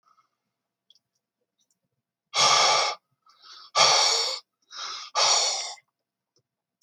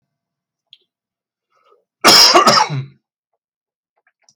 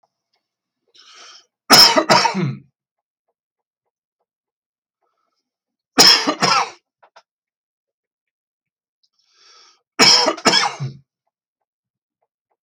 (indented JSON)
{
  "exhalation_length": "6.8 s",
  "exhalation_amplitude": 21885,
  "exhalation_signal_mean_std_ratio": 0.43,
  "cough_length": "4.4 s",
  "cough_amplitude": 32768,
  "cough_signal_mean_std_ratio": 0.33,
  "three_cough_length": "12.6 s",
  "three_cough_amplitude": 32768,
  "three_cough_signal_mean_std_ratio": 0.3,
  "survey_phase": "beta (2021-08-13 to 2022-03-07)",
  "age": "45-64",
  "gender": "Male",
  "wearing_mask": "No",
  "symptom_none": true,
  "smoker_status": "Never smoked",
  "respiratory_condition_asthma": false,
  "respiratory_condition_other": false,
  "recruitment_source": "REACT",
  "submission_delay": "2 days",
  "covid_test_result": "Negative",
  "covid_test_method": "RT-qPCR"
}